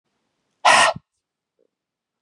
{"exhalation_length": "2.2 s", "exhalation_amplitude": 30195, "exhalation_signal_mean_std_ratio": 0.29, "survey_phase": "beta (2021-08-13 to 2022-03-07)", "age": "18-44", "gender": "Male", "wearing_mask": "No", "symptom_sore_throat": true, "symptom_onset": "5 days", "smoker_status": "Never smoked", "respiratory_condition_asthma": false, "respiratory_condition_other": false, "recruitment_source": "Test and Trace", "submission_delay": "1 day", "covid_test_result": "Positive", "covid_test_method": "RT-qPCR", "covid_ct_value": 19.9, "covid_ct_gene": "N gene", "covid_ct_mean": 20.2, "covid_viral_load": "240000 copies/ml", "covid_viral_load_category": "Low viral load (10K-1M copies/ml)"}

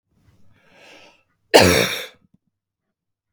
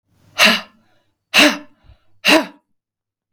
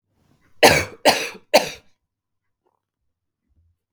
{"cough_length": "3.3 s", "cough_amplitude": 32768, "cough_signal_mean_std_ratio": 0.27, "exhalation_length": "3.3 s", "exhalation_amplitude": 32768, "exhalation_signal_mean_std_ratio": 0.35, "three_cough_length": "3.9 s", "three_cough_amplitude": 32768, "three_cough_signal_mean_std_ratio": 0.27, "survey_phase": "beta (2021-08-13 to 2022-03-07)", "age": "18-44", "gender": "Female", "wearing_mask": "No", "symptom_fatigue": true, "smoker_status": "Never smoked", "respiratory_condition_asthma": false, "respiratory_condition_other": false, "recruitment_source": "Test and Trace", "submission_delay": "3 days", "covid_test_result": "Negative", "covid_test_method": "RT-qPCR"}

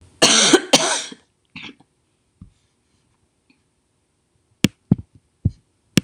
{"cough_length": "6.0 s", "cough_amplitude": 26028, "cough_signal_mean_std_ratio": 0.28, "survey_phase": "beta (2021-08-13 to 2022-03-07)", "age": "65+", "gender": "Female", "wearing_mask": "No", "symptom_none": true, "smoker_status": "Never smoked", "respiratory_condition_asthma": false, "respiratory_condition_other": false, "recruitment_source": "REACT", "submission_delay": "1 day", "covid_test_result": "Negative", "covid_test_method": "RT-qPCR"}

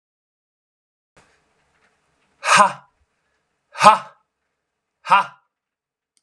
{"exhalation_length": "6.2 s", "exhalation_amplitude": 32768, "exhalation_signal_mean_std_ratio": 0.23, "survey_phase": "alpha (2021-03-01 to 2021-08-12)", "age": "18-44", "gender": "Male", "wearing_mask": "No", "symptom_cough_any": true, "symptom_new_continuous_cough": true, "symptom_diarrhoea": true, "symptom_fatigue": true, "symptom_fever_high_temperature": true, "symptom_headache": true, "symptom_onset": "7 days", "smoker_status": "Never smoked", "respiratory_condition_asthma": false, "respiratory_condition_other": false, "recruitment_source": "Test and Trace", "submission_delay": "2 days", "covid_test_result": "Positive", "covid_test_method": "RT-qPCR", "covid_ct_value": 16.0, "covid_ct_gene": "ORF1ab gene", "covid_ct_mean": 16.5, "covid_viral_load": "4000000 copies/ml", "covid_viral_load_category": "High viral load (>1M copies/ml)"}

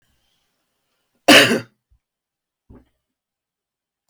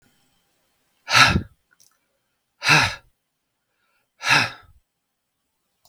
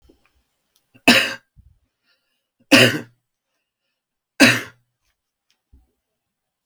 {"cough_length": "4.1 s", "cough_amplitude": 32768, "cough_signal_mean_std_ratio": 0.21, "exhalation_length": "5.9 s", "exhalation_amplitude": 32768, "exhalation_signal_mean_std_ratio": 0.29, "three_cough_length": "6.7 s", "three_cough_amplitude": 32768, "three_cough_signal_mean_std_ratio": 0.24, "survey_phase": "beta (2021-08-13 to 2022-03-07)", "age": "45-64", "gender": "Male", "wearing_mask": "No", "symptom_none": true, "smoker_status": "Ex-smoker", "respiratory_condition_asthma": false, "respiratory_condition_other": false, "recruitment_source": "Test and Trace", "submission_delay": "2 days", "covid_test_result": "Positive", "covid_test_method": "RT-qPCR", "covid_ct_value": 19.6, "covid_ct_gene": "N gene"}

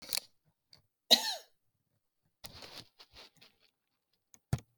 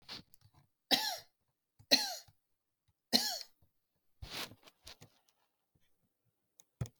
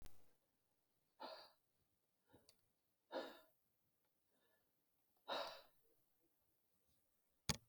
{"cough_length": "4.8 s", "cough_amplitude": 15298, "cough_signal_mean_std_ratio": 0.19, "three_cough_length": "7.0 s", "three_cough_amplitude": 9286, "three_cough_signal_mean_std_ratio": 0.26, "exhalation_length": "7.7 s", "exhalation_amplitude": 2919, "exhalation_signal_mean_std_ratio": 0.29, "survey_phase": "beta (2021-08-13 to 2022-03-07)", "age": "45-64", "gender": "Female", "wearing_mask": "No", "symptom_cough_any": true, "symptom_runny_or_blocked_nose": true, "symptom_fatigue": true, "smoker_status": "Ex-smoker", "respiratory_condition_asthma": false, "respiratory_condition_other": false, "recruitment_source": "REACT", "submission_delay": "1 day", "covid_test_result": "Negative", "covid_test_method": "RT-qPCR"}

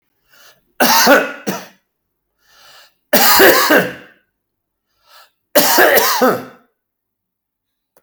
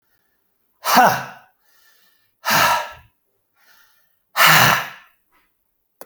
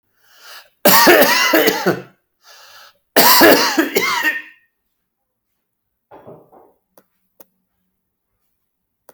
{"three_cough_length": "8.0 s", "three_cough_amplitude": 32768, "three_cough_signal_mean_std_ratio": 0.44, "exhalation_length": "6.1 s", "exhalation_amplitude": 32768, "exhalation_signal_mean_std_ratio": 0.36, "cough_length": "9.1 s", "cough_amplitude": 32768, "cough_signal_mean_std_ratio": 0.4, "survey_phase": "beta (2021-08-13 to 2022-03-07)", "age": "65+", "gender": "Male", "wearing_mask": "No", "symptom_fatigue": true, "smoker_status": "Never smoked", "respiratory_condition_asthma": false, "respiratory_condition_other": false, "recruitment_source": "REACT", "submission_delay": "1 day", "covid_test_result": "Negative", "covid_test_method": "RT-qPCR"}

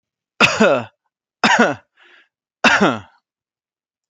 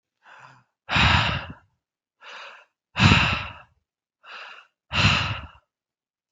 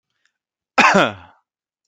{"three_cough_length": "4.1 s", "three_cough_amplitude": 29921, "three_cough_signal_mean_std_ratio": 0.4, "exhalation_length": "6.3 s", "exhalation_amplitude": 24873, "exhalation_signal_mean_std_ratio": 0.39, "cough_length": "1.9 s", "cough_amplitude": 32217, "cough_signal_mean_std_ratio": 0.33, "survey_phase": "beta (2021-08-13 to 2022-03-07)", "age": "18-44", "gender": "Male", "wearing_mask": "No", "symptom_none": true, "smoker_status": "Never smoked", "respiratory_condition_asthma": false, "respiratory_condition_other": false, "recruitment_source": "REACT", "submission_delay": "3 days", "covid_test_result": "Negative", "covid_test_method": "RT-qPCR"}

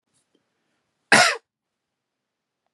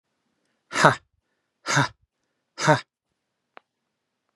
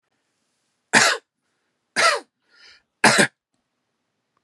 {"cough_length": "2.7 s", "cough_amplitude": 32000, "cough_signal_mean_std_ratio": 0.22, "exhalation_length": "4.4 s", "exhalation_amplitude": 32767, "exhalation_signal_mean_std_ratio": 0.25, "three_cough_length": "4.4 s", "three_cough_amplitude": 32681, "three_cough_signal_mean_std_ratio": 0.3, "survey_phase": "beta (2021-08-13 to 2022-03-07)", "age": "45-64", "gender": "Male", "wearing_mask": "No", "symptom_runny_or_blocked_nose": true, "symptom_onset": "2 days", "smoker_status": "Ex-smoker", "respiratory_condition_asthma": false, "respiratory_condition_other": false, "recruitment_source": "Test and Trace", "submission_delay": "1 day", "covid_test_result": "Positive", "covid_test_method": "RT-qPCR", "covid_ct_value": 21.4, "covid_ct_gene": "ORF1ab gene", "covid_ct_mean": 21.9, "covid_viral_load": "66000 copies/ml", "covid_viral_load_category": "Low viral load (10K-1M copies/ml)"}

